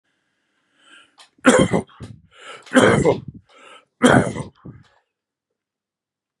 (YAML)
three_cough_length: 6.4 s
three_cough_amplitude: 32767
three_cough_signal_mean_std_ratio: 0.33
survey_phase: beta (2021-08-13 to 2022-03-07)
age: 65+
gender: Male
wearing_mask: 'No'
symptom_none: true
smoker_status: Ex-smoker
respiratory_condition_asthma: false
respiratory_condition_other: false
recruitment_source: REACT
submission_delay: 1 day
covid_test_result: Negative
covid_test_method: RT-qPCR
influenza_a_test_result: Negative
influenza_b_test_result: Negative